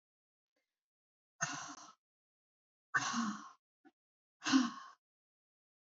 {
  "exhalation_length": "5.8 s",
  "exhalation_amplitude": 4175,
  "exhalation_signal_mean_std_ratio": 0.3,
  "survey_phase": "beta (2021-08-13 to 2022-03-07)",
  "age": "65+",
  "gender": "Female",
  "wearing_mask": "No",
  "symptom_none": true,
  "smoker_status": "Never smoked",
  "respiratory_condition_asthma": false,
  "respiratory_condition_other": false,
  "recruitment_source": "REACT",
  "submission_delay": "1 day",
  "covid_test_result": "Negative",
  "covid_test_method": "RT-qPCR",
  "influenza_a_test_result": "Negative",
  "influenza_b_test_result": "Negative"
}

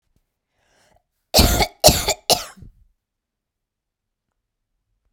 {
  "cough_length": "5.1 s",
  "cough_amplitude": 32768,
  "cough_signal_mean_std_ratio": 0.27,
  "survey_phase": "beta (2021-08-13 to 2022-03-07)",
  "age": "18-44",
  "gender": "Female",
  "wearing_mask": "No",
  "symptom_cough_any": true,
  "symptom_runny_or_blocked_nose": true,
  "symptom_fatigue": true,
  "symptom_onset": "3 days",
  "smoker_status": "Never smoked",
  "respiratory_condition_asthma": false,
  "respiratory_condition_other": false,
  "recruitment_source": "Test and Trace",
  "submission_delay": "1 day",
  "covid_test_result": "Negative",
  "covid_test_method": "ePCR"
}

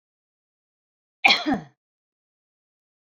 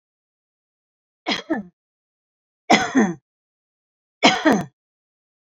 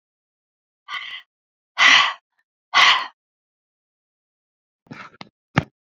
{
  "cough_length": "3.2 s",
  "cough_amplitude": 27442,
  "cough_signal_mean_std_ratio": 0.22,
  "three_cough_length": "5.5 s",
  "three_cough_amplitude": 29283,
  "three_cough_signal_mean_std_ratio": 0.31,
  "exhalation_length": "6.0 s",
  "exhalation_amplitude": 28920,
  "exhalation_signal_mean_std_ratio": 0.28,
  "survey_phase": "beta (2021-08-13 to 2022-03-07)",
  "age": "65+",
  "gender": "Female",
  "wearing_mask": "No",
  "symptom_none": true,
  "smoker_status": "Never smoked",
  "respiratory_condition_asthma": false,
  "respiratory_condition_other": false,
  "recruitment_source": "REACT",
  "submission_delay": "1 day",
  "covid_test_result": "Negative",
  "covid_test_method": "RT-qPCR"
}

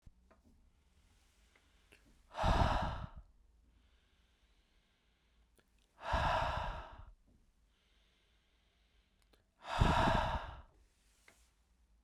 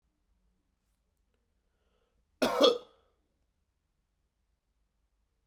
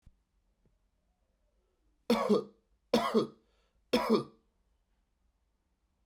{
  "exhalation_length": "12.0 s",
  "exhalation_amplitude": 6088,
  "exhalation_signal_mean_std_ratio": 0.36,
  "cough_length": "5.5 s",
  "cough_amplitude": 11717,
  "cough_signal_mean_std_ratio": 0.19,
  "three_cough_length": "6.1 s",
  "three_cough_amplitude": 6342,
  "three_cough_signal_mean_std_ratio": 0.31,
  "survey_phase": "beta (2021-08-13 to 2022-03-07)",
  "age": "18-44",
  "gender": "Male",
  "wearing_mask": "No",
  "symptom_cough_any": true,
  "symptom_onset": "4 days",
  "smoker_status": "Never smoked",
  "respiratory_condition_asthma": false,
  "respiratory_condition_other": false,
  "recruitment_source": "Test and Trace",
  "submission_delay": "3 days",
  "covid_test_result": "Positive",
  "covid_test_method": "RT-qPCR",
  "covid_ct_value": 29.4,
  "covid_ct_gene": "N gene"
}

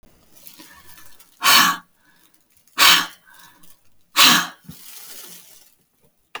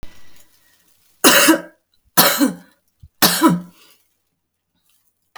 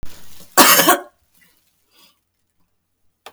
{
  "exhalation_length": "6.4 s",
  "exhalation_amplitude": 32768,
  "exhalation_signal_mean_std_ratio": 0.33,
  "three_cough_length": "5.4 s",
  "three_cough_amplitude": 32768,
  "three_cough_signal_mean_std_ratio": 0.37,
  "cough_length": "3.3 s",
  "cough_amplitude": 32768,
  "cough_signal_mean_std_ratio": 0.32,
  "survey_phase": "alpha (2021-03-01 to 2021-08-12)",
  "age": "45-64",
  "gender": "Female",
  "wearing_mask": "No",
  "symptom_none": true,
  "smoker_status": "Never smoked",
  "respiratory_condition_asthma": false,
  "respiratory_condition_other": false,
  "recruitment_source": "REACT",
  "submission_delay": "2 days",
  "covid_test_result": "Negative",
  "covid_test_method": "RT-qPCR"
}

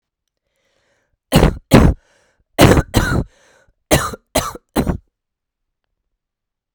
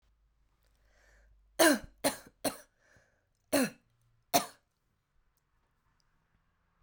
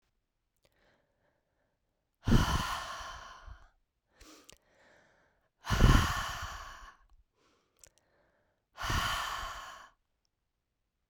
{
  "cough_length": "6.7 s",
  "cough_amplitude": 32768,
  "cough_signal_mean_std_ratio": 0.34,
  "three_cough_length": "6.8 s",
  "three_cough_amplitude": 10902,
  "three_cough_signal_mean_std_ratio": 0.24,
  "exhalation_length": "11.1 s",
  "exhalation_amplitude": 10466,
  "exhalation_signal_mean_std_ratio": 0.32,
  "survey_phase": "beta (2021-08-13 to 2022-03-07)",
  "age": "18-44",
  "gender": "Female",
  "wearing_mask": "No",
  "symptom_cough_any": true,
  "symptom_new_continuous_cough": true,
  "symptom_runny_or_blocked_nose": true,
  "symptom_sore_throat": true,
  "symptom_fatigue": true,
  "symptom_fever_high_temperature": true,
  "symptom_headache": true,
  "symptom_change_to_sense_of_smell_or_taste": true,
  "symptom_loss_of_taste": true,
  "symptom_onset": "3 days",
  "smoker_status": "Never smoked",
  "respiratory_condition_asthma": false,
  "respiratory_condition_other": false,
  "recruitment_source": "Test and Trace",
  "submission_delay": "1 day",
  "covid_test_result": "Positive",
  "covid_test_method": "RT-qPCR",
  "covid_ct_value": 17.2,
  "covid_ct_gene": "ORF1ab gene",
  "covid_ct_mean": 18.4,
  "covid_viral_load": "940000 copies/ml",
  "covid_viral_load_category": "Low viral load (10K-1M copies/ml)"
}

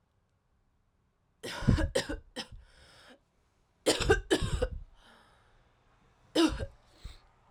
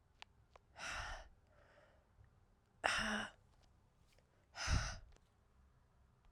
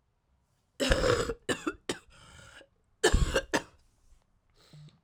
{
  "three_cough_length": "7.5 s",
  "three_cough_amplitude": 10489,
  "three_cough_signal_mean_std_ratio": 0.36,
  "exhalation_length": "6.3 s",
  "exhalation_amplitude": 5822,
  "exhalation_signal_mean_std_ratio": 0.38,
  "cough_length": "5.0 s",
  "cough_amplitude": 10406,
  "cough_signal_mean_std_ratio": 0.38,
  "survey_phase": "alpha (2021-03-01 to 2021-08-12)",
  "age": "18-44",
  "gender": "Female",
  "wearing_mask": "No",
  "symptom_cough_any": true,
  "symptom_new_continuous_cough": true,
  "symptom_shortness_of_breath": true,
  "symptom_fatigue": true,
  "symptom_headache": true,
  "symptom_onset": "4 days",
  "smoker_status": "Current smoker (1 to 10 cigarettes per day)",
  "respiratory_condition_asthma": false,
  "respiratory_condition_other": false,
  "recruitment_source": "Test and Trace",
  "submission_delay": "1 day",
  "covid_test_result": "Positive",
  "covid_test_method": "RT-qPCR"
}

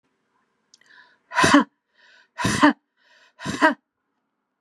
{
  "exhalation_length": "4.6 s",
  "exhalation_amplitude": 28400,
  "exhalation_signal_mean_std_ratio": 0.32,
  "survey_phase": "beta (2021-08-13 to 2022-03-07)",
  "age": "45-64",
  "gender": "Female",
  "wearing_mask": "No",
  "symptom_none": true,
  "smoker_status": "Never smoked",
  "respiratory_condition_asthma": false,
  "respiratory_condition_other": false,
  "recruitment_source": "REACT",
  "submission_delay": "1 day",
  "covid_test_result": "Negative",
  "covid_test_method": "RT-qPCR"
}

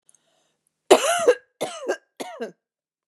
{
  "three_cough_length": "3.1 s",
  "three_cough_amplitude": 31960,
  "three_cough_signal_mean_std_ratio": 0.33,
  "survey_phase": "beta (2021-08-13 to 2022-03-07)",
  "age": "45-64",
  "gender": "Female",
  "wearing_mask": "No",
  "symptom_none": true,
  "smoker_status": "Never smoked",
  "respiratory_condition_asthma": false,
  "respiratory_condition_other": false,
  "recruitment_source": "Test and Trace",
  "submission_delay": "2 days",
  "covid_test_result": "Positive",
  "covid_test_method": "RT-qPCR",
  "covid_ct_value": 35.9,
  "covid_ct_gene": "N gene"
}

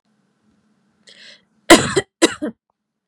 {
  "cough_length": "3.1 s",
  "cough_amplitude": 32768,
  "cough_signal_mean_std_ratio": 0.24,
  "survey_phase": "beta (2021-08-13 to 2022-03-07)",
  "age": "18-44",
  "gender": "Female",
  "wearing_mask": "No",
  "symptom_none": true,
  "smoker_status": "Never smoked",
  "respiratory_condition_asthma": false,
  "respiratory_condition_other": false,
  "recruitment_source": "REACT",
  "submission_delay": "0 days",
  "covid_test_result": "Negative",
  "covid_test_method": "RT-qPCR",
  "influenza_a_test_result": "Negative",
  "influenza_b_test_result": "Negative"
}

